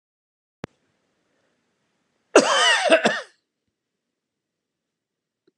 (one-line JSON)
{"cough_length": "5.6 s", "cough_amplitude": 32767, "cough_signal_mean_std_ratio": 0.28, "survey_phase": "beta (2021-08-13 to 2022-03-07)", "age": "65+", "gender": "Male", "wearing_mask": "No", "symptom_none": true, "smoker_status": "Never smoked", "respiratory_condition_asthma": false, "respiratory_condition_other": false, "recruitment_source": "REACT", "submission_delay": "2 days", "covid_test_result": "Negative", "covid_test_method": "RT-qPCR"}